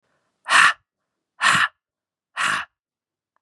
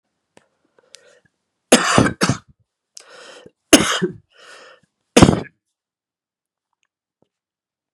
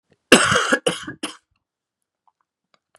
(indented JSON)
{
  "exhalation_length": "3.4 s",
  "exhalation_amplitude": 28494,
  "exhalation_signal_mean_std_ratio": 0.36,
  "three_cough_length": "7.9 s",
  "three_cough_amplitude": 32768,
  "three_cough_signal_mean_std_ratio": 0.25,
  "cough_length": "3.0 s",
  "cough_amplitude": 32768,
  "cough_signal_mean_std_ratio": 0.32,
  "survey_phase": "beta (2021-08-13 to 2022-03-07)",
  "age": "45-64",
  "gender": "Male",
  "wearing_mask": "No",
  "symptom_cough_any": true,
  "symptom_runny_or_blocked_nose": true,
  "symptom_fatigue": true,
  "symptom_onset": "3 days",
  "smoker_status": "Never smoked",
  "respiratory_condition_asthma": false,
  "respiratory_condition_other": false,
  "recruitment_source": "Test and Trace",
  "submission_delay": "1 day",
  "covid_test_result": "Positive",
  "covid_test_method": "RT-qPCR",
  "covid_ct_value": 18.3,
  "covid_ct_gene": "ORF1ab gene",
  "covid_ct_mean": 18.4,
  "covid_viral_load": "940000 copies/ml",
  "covid_viral_load_category": "Low viral load (10K-1M copies/ml)"
}